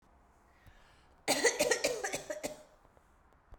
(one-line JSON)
{"cough_length": "3.6 s", "cough_amplitude": 5837, "cough_signal_mean_std_ratio": 0.42, "survey_phase": "beta (2021-08-13 to 2022-03-07)", "age": "18-44", "gender": "Female", "wearing_mask": "No", "symptom_cough_any": true, "symptom_runny_or_blocked_nose": true, "symptom_sore_throat": true, "symptom_fatigue": true, "symptom_change_to_sense_of_smell_or_taste": true, "symptom_loss_of_taste": true, "symptom_onset": "4 days", "smoker_status": "Never smoked", "respiratory_condition_asthma": false, "respiratory_condition_other": false, "recruitment_source": "Test and Trace", "submission_delay": "2 days", "covid_test_result": "Positive", "covid_test_method": "RT-qPCR", "covid_ct_value": 19.0, "covid_ct_gene": "ORF1ab gene", "covid_ct_mean": 19.5, "covid_viral_load": "400000 copies/ml", "covid_viral_load_category": "Low viral load (10K-1M copies/ml)"}